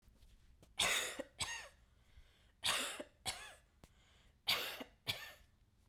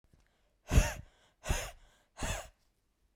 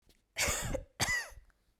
three_cough_length: 5.9 s
three_cough_amplitude: 3212
three_cough_signal_mean_std_ratio: 0.44
exhalation_length: 3.2 s
exhalation_amplitude: 8172
exhalation_signal_mean_std_ratio: 0.32
cough_length: 1.8 s
cough_amplitude: 4139
cough_signal_mean_std_ratio: 0.56
survey_phase: beta (2021-08-13 to 2022-03-07)
age: 18-44
gender: Female
wearing_mask: 'No'
symptom_none: true
smoker_status: Never smoked
respiratory_condition_asthma: false
respiratory_condition_other: false
recruitment_source: Test and Trace
submission_delay: 2 days
covid_test_result: Positive
covid_test_method: RT-qPCR
covid_ct_value: 33.5
covid_ct_gene: ORF1ab gene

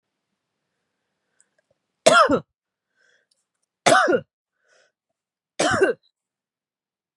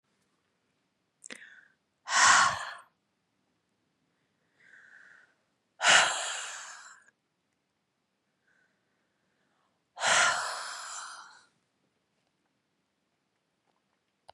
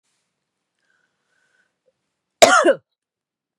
three_cough_length: 7.2 s
three_cough_amplitude: 32653
three_cough_signal_mean_std_ratio: 0.29
exhalation_length: 14.3 s
exhalation_amplitude: 15176
exhalation_signal_mean_std_ratio: 0.27
cough_length: 3.6 s
cough_amplitude: 32768
cough_signal_mean_std_ratio: 0.23
survey_phase: beta (2021-08-13 to 2022-03-07)
age: 18-44
gender: Female
wearing_mask: 'No'
symptom_none: true
smoker_status: Never smoked
respiratory_condition_asthma: false
respiratory_condition_other: false
recruitment_source: REACT
submission_delay: 1 day
covid_test_result: Negative
covid_test_method: RT-qPCR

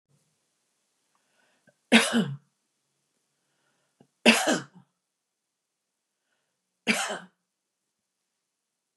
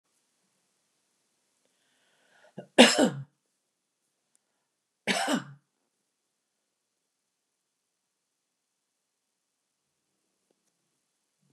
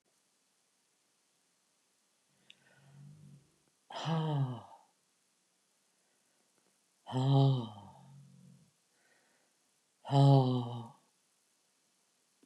three_cough_length: 9.0 s
three_cough_amplitude: 23815
three_cough_signal_mean_std_ratio: 0.23
cough_length: 11.5 s
cough_amplitude: 28653
cough_signal_mean_std_ratio: 0.16
exhalation_length: 12.5 s
exhalation_amplitude: 7125
exhalation_signal_mean_std_ratio: 0.31
survey_phase: beta (2021-08-13 to 2022-03-07)
age: 65+
gender: Female
wearing_mask: 'No'
symptom_runny_or_blocked_nose: true
symptom_sore_throat: true
symptom_fatigue: true
symptom_onset: 9 days
smoker_status: Ex-smoker
respiratory_condition_asthma: false
respiratory_condition_other: false
recruitment_source: REACT
submission_delay: 4 days
covid_test_result: Negative
covid_test_method: RT-qPCR
influenza_a_test_result: Negative
influenza_b_test_result: Negative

